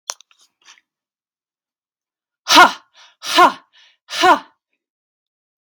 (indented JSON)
{
  "exhalation_length": "5.8 s",
  "exhalation_amplitude": 32767,
  "exhalation_signal_mean_std_ratio": 0.27,
  "survey_phase": "beta (2021-08-13 to 2022-03-07)",
  "age": "18-44",
  "gender": "Female",
  "wearing_mask": "No",
  "symptom_none": true,
  "smoker_status": "Ex-smoker",
  "respiratory_condition_asthma": false,
  "respiratory_condition_other": false,
  "recruitment_source": "REACT",
  "submission_delay": "2 days",
  "covid_test_result": "Negative",
  "covid_test_method": "RT-qPCR"
}